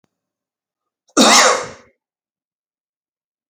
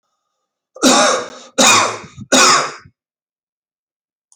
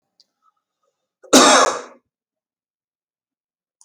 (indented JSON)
{
  "exhalation_length": "3.5 s",
  "exhalation_amplitude": 32551,
  "exhalation_signal_mean_std_ratio": 0.29,
  "three_cough_length": "4.4 s",
  "three_cough_amplitude": 32768,
  "three_cough_signal_mean_std_ratio": 0.44,
  "cough_length": "3.8 s",
  "cough_amplitude": 32767,
  "cough_signal_mean_std_ratio": 0.26,
  "survey_phase": "beta (2021-08-13 to 2022-03-07)",
  "age": "45-64",
  "gender": "Male",
  "wearing_mask": "No",
  "symptom_none": true,
  "smoker_status": "Never smoked",
  "respiratory_condition_asthma": false,
  "respiratory_condition_other": false,
  "recruitment_source": "REACT",
  "submission_delay": "2 days",
  "covid_test_result": "Negative",
  "covid_test_method": "RT-qPCR"
}